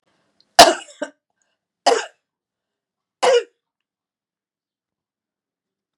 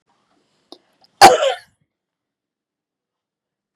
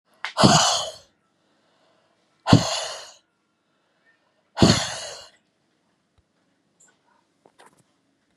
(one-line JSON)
{"three_cough_length": "6.0 s", "three_cough_amplitude": 32768, "three_cough_signal_mean_std_ratio": 0.21, "cough_length": "3.8 s", "cough_amplitude": 32768, "cough_signal_mean_std_ratio": 0.2, "exhalation_length": "8.4 s", "exhalation_amplitude": 32768, "exhalation_signal_mean_std_ratio": 0.28, "survey_phase": "beta (2021-08-13 to 2022-03-07)", "age": "65+", "gender": "Female", "wearing_mask": "No", "symptom_none": true, "smoker_status": "Ex-smoker", "respiratory_condition_asthma": false, "respiratory_condition_other": false, "recruitment_source": "REACT", "submission_delay": "3 days", "covid_test_result": "Negative", "covid_test_method": "RT-qPCR", "influenza_a_test_result": "Negative", "influenza_b_test_result": "Negative"}